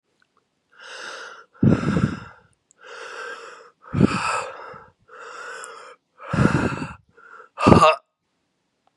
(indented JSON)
{
  "exhalation_length": "9.0 s",
  "exhalation_amplitude": 32768,
  "exhalation_signal_mean_std_ratio": 0.38,
  "survey_phase": "beta (2021-08-13 to 2022-03-07)",
  "age": "18-44",
  "gender": "Male",
  "wearing_mask": "No",
  "symptom_cough_any": true,
  "symptom_runny_or_blocked_nose": true,
  "symptom_headache": true,
  "symptom_onset": "3 days",
  "smoker_status": "Current smoker (1 to 10 cigarettes per day)",
  "respiratory_condition_asthma": false,
  "respiratory_condition_other": false,
  "recruitment_source": "Test and Trace",
  "submission_delay": "1 day",
  "covid_test_result": "Positive",
  "covid_test_method": "ePCR"
}